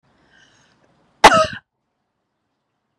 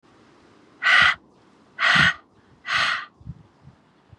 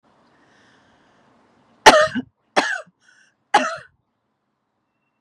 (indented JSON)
{
  "cough_length": "3.0 s",
  "cough_amplitude": 32768,
  "cough_signal_mean_std_ratio": 0.21,
  "exhalation_length": "4.2 s",
  "exhalation_amplitude": 21989,
  "exhalation_signal_mean_std_ratio": 0.41,
  "three_cough_length": "5.2 s",
  "three_cough_amplitude": 32768,
  "three_cough_signal_mean_std_ratio": 0.24,
  "survey_phase": "beta (2021-08-13 to 2022-03-07)",
  "age": "18-44",
  "gender": "Female",
  "wearing_mask": "No",
  "symptom_runny_or_blocked_nose": true,
  "symptom_onset": "3 days",
  "smoker_status": "Current smoker (1 to 10 cigarettes per day)",
  "respiratory_condition_asthma": false,
  "respiratory_condition_other": false,
  "recruitment_source": "REACT",
  "submission_delay": "1 day",
  "covid_test_result": "Negative",
  "covid_test_method": "RT-qPCR",
  "influenza_a_test_result": "Unknown/Void",
  "influenza_b_test_result": "Unknown/Void"
}